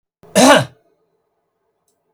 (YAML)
cough_length: 2.1 s
cough_amplitude: 32768
cough_signal_mean_std_ratio: 0.3
survey_phase: beta (2021-08-13 to 2022-03-07)
age: 65+
gender: Male
wearing_mask: 'No'
symptom_none: true
smoker_status: Never smoked
respiratory_condition_asthma: true
respiratory_condition_other: true
recruitment_source: REACT
submission_delay: 0 days
covid_test_result: Negative
covid_test_method: RT-qPCR
influenza_a_test_result: Negative
influenza_b_test_result: Negative